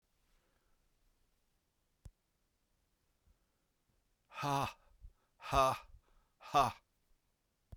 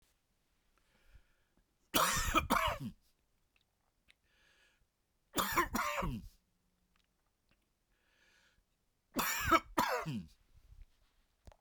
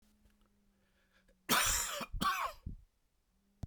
{"exhalation_length": "7.8 s", "exhalation_amplitude": 4009, "exhalation_signal_mean_std_ratio": 0.25, "three_cough_length": "11.6 s", "three_cough_amplitude": 6541, "three_cough_signal_mean_std_ratio": 0.37, "cough_length": "3.7 s", "cough_amplitude": 5723, "cough_signal_mean_std_ratio": 0.43, "survey_phase": "beta (2021-08-13 to 2022-03-07)", "age": "45-64", "gender": "Male", "wearing_mask": "No", "symptom_cough_any": true, "symptom_new_continuous_cough": true, "symptom_sore_throat": true, "symptom_fatigue": true, "symptom_fever_high_temperature": true, "symptom_headache": true, "symptom_onset": "4 days", "smoker_status": "Never smoked", "respiratory_condition_asthma": false, "respiratory_condition_other": false, "recruitment_source": "Test and Trace", "submission_delay": "1 day", "covid_test_result": "Positive", "covid_test_method": "RT-qPCR", "covid_ct_value": 27.2, "covid_ct_gene": "ORF1ab gene", "covid_ct_mean": 28.0, "covid_viral_load": "650 copies/ml", "covid_viral_load_category": "Minimal viral load (< 10K copies/ml)"}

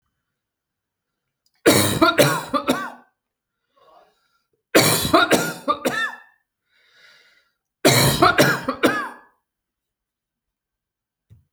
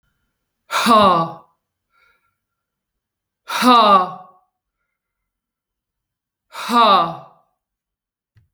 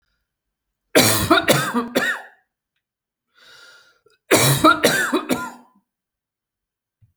{"three_cough_length": "11.5 s", "three_cough_amplitude": 30801, "three_cough_signal_mean_std_ratio": 0.4, "exhalation_length": "8.5 s", "exhalation_amplitude": 28905, "exhalation_signal_mean_std_ratio": 0.35, "cough_length": "7.2 s", "cough_amplitude": 32768, "cough_signal_mean_std_ratio": 0.42, "survey_phase": "alpha (2021-03-01 to 2021-08-12)", "age": "45-64", "gender": "Female", "wearing_mask": "No", "symptom_none": true, "smoker_status": "Never smoked", "respiratory_condition_asthma": false, "respiratory_condition_other": false, "recruitment_source": "REACT", "submission_delay": "3 days", "covid_test_result": "Negative", "covid_test_method": "RT-qPCR"}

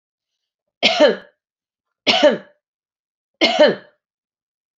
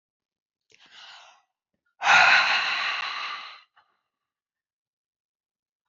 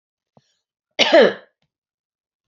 {"three_cough_length": "4.8 s", "three_cough_amplitude": 28996, "three_cough_signal_mean_std_ratio": 0.34, "exhalation_length": "5.9 s", "exhalation_amplitude": 19640, "exhalation_signal_mean_std_ratio": 0.34, "cough_length": "2.5 s", "cough_amplitude": 28664, "cough_signal_mean_std_ratio": 0.27, "survey_phase": "beta (2021-08-13 to 2022-03-07)", "age": "45-64", "gender": "Female", "wearing_mask": "No", "symptom_headache": true, "smoker_status": "Never smoked", "respiratory_condition_asthma": false, "respiratory_condition_other": false, "recruitment_source": "REACT", "submission_delay": "3 days", "covid_test_result": "Negative", "covid_test_method": "RT-qPCR", "influenza_a_test_result": "Negative", "influenza_b_test_result": "Negative"}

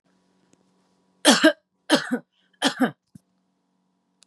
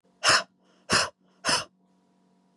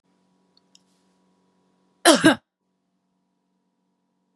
{"three_cough_length": "4.3 s", "three_cough_amplitude": 29497, "three_cough_signal_mean_std_ratio": 0.29, "exhalation_length": "2.6 s", "exhalation_amplitude": 16400, "exhalation_signal_mean_std_ratio": 0.36, "cough_length": "4.4 s", "cough_amplitude": 32767, "cough_signal_mean_std_ratio": 0.19, "survey_phase": "beta (2021-08-13 to 2022-03-07)", "age": "45-64", "gender": "Female", "wearing_mask": "No", "symptom_none": true, "smoker_status": "Ex-smoker", "respiratory_condition_asthma": true, "respiratory_condition_other": false, "recruitment_source": "REACT", "submission_delay": "1 day", "covid_test_result": "Negative", "covid_test_method": "RT-qPCR", "influenza_a_test_result": "Unknown/Void", "influenza_b_test_result": "Unknown/Void"}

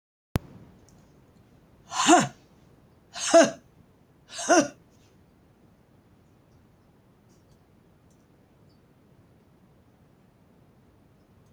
{"exhalation_length": "11.5 s", "exhalation_amplitude": 14865, "exhalation_signal_mean_std_ratio": 0.23, "survey_phase": "beta (2021-08-13 to 2022-03-07)", "age": "65+", "gender": "Female", "wearing_mask": "No", "symptom_none": true, "smoker_status": "Ex-smoker", "respiratory_condition_asthma": false, "respiratory_condition_other": false, "recruitment_source": "REACT", "submission_delay": "2 days", "covid_test_result": "Negative", "covid_test_method": "RT-qPCR", "influenza_a_test_result": "Negative", "influenza_b_test_result": "Negative"}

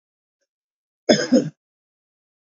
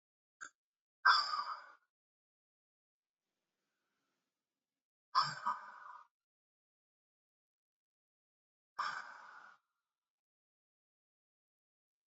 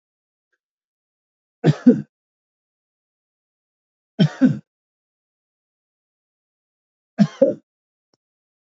{"cough_length": "2.6 s", "cough_amplitude": 28343, "cough_signal_mean_std_ratio": 0.26, "exhalation_length": "12.1 s", "exhalation_amplitude": 5604, "exhalation_signal_mean_std_ratio": 0.21, "three_cough_length": "8.8 s", "three_cough_amplitude": 27156, "three_cough_signal_mean_std_ratio": 0.21, "survey_phase": "alpha (2021-03-01 to 2021-08-12)", "age": "65+", "gender": "Male", "wearing_mask": "No", "symptom_fatigue": true, "smoker_status": "Ex-smoker", "respiratory_condition_asthma": false, "respiratory_condition_other": false, "recruitment_source": "REACT", "submission_delay": "1 day", "covid_test_result": "Negative", "covid_test_method": "RT-qPCR"}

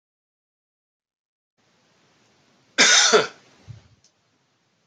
{"cough_length": "4.9 s", "cough_amplitude": 26052, "cough_signal_mean_std_ratio": 0.26, "survey_phase": "beta (2021-08-13 to 2022-03-07)", "age": "45-64", "gender": "Male", "wearing_mask": "No", "symptom_cough_any": true, "symptom_runny_or_blocked_nose": true, "symptom_fatigue": true, "symptom_fever_high_temperature": true, "symptom_change_to_sense_of_smell_or_taste": true, "symptom_loss_of_taste": true, "symptom_onset": "4 days", "smoker_status": "Never smoked", "respiratory_condition_asthma": false, "respiratory_condition_other": false, "recruitment_source": "Test and Trace", "submission_delay": "2 days", "covid_test_result": "Positive", "covid_test_method": "RT-qPCR", "covid_ct_value": 22.2, "covid_ct_gene": "N gene"}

